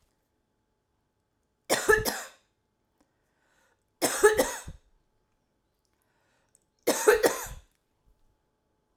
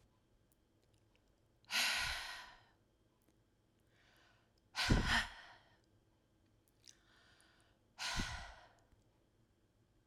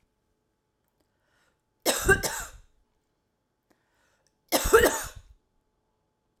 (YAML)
three_cough_length: 9.0 s
three_cough_amplitude: 15126
three_cough_signal_mean_std_ratio: 0.29
exhalation_length: 10.1 s
exhalation_amplitude: 3146
exhalation_signal_mean_std_ratio: 0.32
cough_length: 6.4 s
cough_amplitude: 20155
cough_signal_mean_std_ratio: 0.27
survey_phase: alpha (2021-03-01 to 2021-08-12)
age: 45-64
gender: Female
wearing_mask: 'No'
symptom_none: true
smoker_status: Never smoked
respiratory_condition_asthma: false
respiratory_condition_other: false
recruitment_source: REACT
submission_delay: 3 days
covid_test_result: Negative
covid_test_method: RT-qPCR